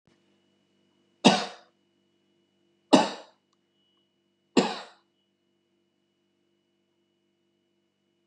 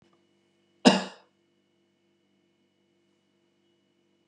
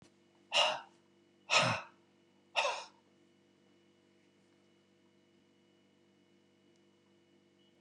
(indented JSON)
{
  "three_cough_length": "8.3 s",
  "three_cough_amplitude": 28319,
  "three_cough_signal_mean_std_ratio": 0.18,
  "cough_length": "4.3 s",
  "cough_amplitude": 23083,
  "cough_signal_mean_std_ratio": 0.15,
  "exhalation_length": "7.8 s",
  "exhalation_amplitude": 7470,
  "exhalation_signal_mean_std_ratio": 0.27,
  "survey_phase": "beta (2021-08-13 to 2022-03-07)",
  "age": "65+",
  "gender": "Male",
  "wearing_mask": "No",
  "symptom_none": true,
  "smoker_status": "Never smoked",
  "respiratory_condition_asthma": false,
  "respiratory_condition_other": false,
  "recruitment_source": "REACT",
  "submission_delay": "1 day",
  "covid_test_result": "Negative",
  "covid_test_method": "RT-qPCR",
  "influenza_a_test_result": "Negative",
  "influenza_b_test_result": "Negative"
}